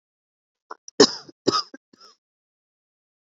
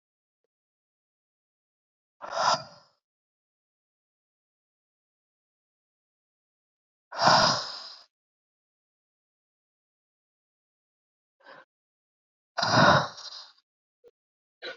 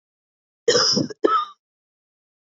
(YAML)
three_cough_length: 3.3 s
three_cough_amplitude: 32522
three_cough_signal_mean_std_ratio: 0.19
exhalation_length: 14.8 s
exhalation_amplitude: 17540
exhalation_signal_mean_std_ratio: 0.23
cough_length: 2.6 s
cough_amplitude: 24578
cough_signal_mean_std_ratio: 0.4
survey_phase: beta (2021-08-13 to 2022-03-07)
age: 18-44
gender: Female
wearing_mask: 'No'
symptom_runny_or_blocked_nose: true
symptom_shortness_of_breath: true
symptom_sore_throat: true
symptom_abdominal_pain: true
symptom_diarrhoea: true
symptom_fatigue: true
symptom_fever_high_temperature: true
symptom_headache: true
symptom_loss_of_taste: true
smoker_status: Ex-smoker
respiratory_condition_asthma: false
respiratory_condition_other: false
recruitment_source: Test and Trace
submission_delay: 2 days
covid_test_result: Positive
covid_test_method: RT-qPCR
covid_ct_value: 31.4
covid_ct_gene: ORF1ab gene
covid_ct_mean: 32.1
covid_viral_load: 29 copies/ml
covid_viral_load_category: Minimal viral load (< 10K copies/ml)